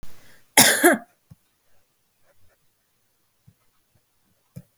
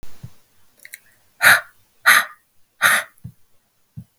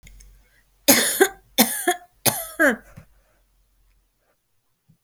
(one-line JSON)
{"cough_length": "4.8 s", "cough_amplitude": 32768, "cough_signal_mean_std_ratio": 0.24, "exhalation_length": "4.2 s", "exhalation_amplitude": 32768, "exhalation_signal_mean_std_ratio": 0.32, "three_cough_length": "5.0 s", "three_cough_amplitude": 32768, "three_cough_signal_mean_std_ratio": 0.34, "survey_phase": "beta (2021-08-13 to 2022-03-07)", "age": "18-44", "gender": "Female", "wearing_mask": "No", "symptom_none": true, "smoker_status": "Ex-smoker", "respiratory_condition_asthma": false, "respiratory_condition_other": false, "recruitment_source": "REACT", "submission_delay": "2 days", "covid_test_result": "Negative", "covid_test_method": "RT-qPCR", "influenza_a_test_result": "Negative", "influenza_b_test_result": "Negative"}